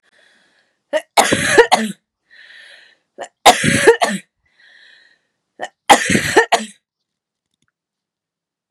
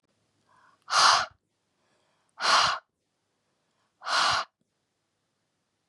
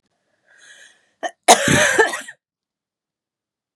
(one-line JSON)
{"three_cough_length": "8.7 s", "three_cough_amplitude": 32768, "three_cough_signal_mean_std_ratio": 0.35, "exhalation_length": "5.9 s", "exhalation_amplitude": 16414, "exhalation_signal_mean_std_ratio": 0.34, "cough_length": "3.8 s", "cough_amplitude": 32768, "cough_signal_mean_std_ratio": 0.32, "survey_phase": "beta (2021-08-13 to 2022-03-07)", "age": "18-44", "gender": "Female", "wearing_mask": "No", "symptom_runny_or_blocked_nose": true, "smoker_status": "Never smoked", "respiratory_condition_asthma": false, "respiratory_condition_other": false, "recruitment_source": "REACT", "submission_delay": "4 days", "covid_test_result": "Negative", "covid_test_method": "RT-qPCR", "influenza_a_test_result": "Negative", "influenza_b_test_result": "Negative"}